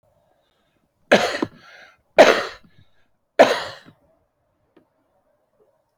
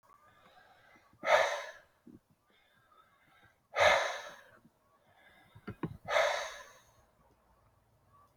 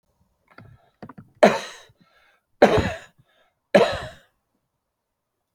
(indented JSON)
{
  "cough_length": "6.0 s",
  "cough_amplitude": 29435,
  "cough_signal_mean_std_ratio": 0.25,
  "exhalation_length": "8.4 s",
  "exhalation_amplitude": 9002,
  "exhalation_signal_mean_std_ratio": 0.32,
  "three_cough_length": "5.5 s",
  "three_cough_amplitude": 28373,
  "three_cough_signal_mean_std_ratio": 0.26,
  "survey_phase": "alpha (2021-03-01 to 2021-08-12)",
  "age": "65+",
  "gender": "Male",
  "wearing_mask": "No",
  "symptom_none": true,
  "smoker_status": "Ex-smoker",
  "respiratory_condition_asthma": false,
  "respiratory_condition_other": false,
  "recruitment_source": "REACT",
  "submission_delay": "1 day",
  "covid_test_result": "Negative",
  "covid_test_method": "RT-qPCR"
}